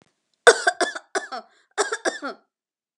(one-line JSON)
{"cough_length": "3.0 s", "cough_amplitude": 32766, "cough_signal_mean_std_ratio": 0.31, "survey_phase": "beta (2021-08-13 to 2022-03-07)", "age": "45-64", "gender": "Female", "wearing_mask": "No", "symptom_none": true, "smoker_status": "Never smoked", "respiratory_condition_asthma": false, "respiratory_condition_other": false, "recruitment_source": "REACT", "submission_delay": "11 days", "covid_test_result": "Negative", "covid_test_method": "RT-qPCR"}